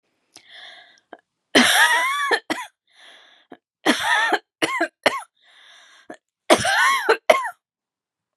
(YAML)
three_cough_length: 8.4 s
three_cough_amplitude: 32759
three_cough_signal_mean_std_ratio: 0.44
survey_phase: beta (2021-08-13 to 2022-03-07)
age: 45-64
gender: Female
wearing_mask: 'No'
symptom_none: true
smoker_status: Never smoked
respiratory_condition_asthma: false
respiratory_condition_other: false
recruitment_source: REACT
submission_delay: 6 days
covid_test_result: Negative
covid_test_method: RT-qPCR
influenza_a_test_result: Negative
influenza_b_test_result: Negative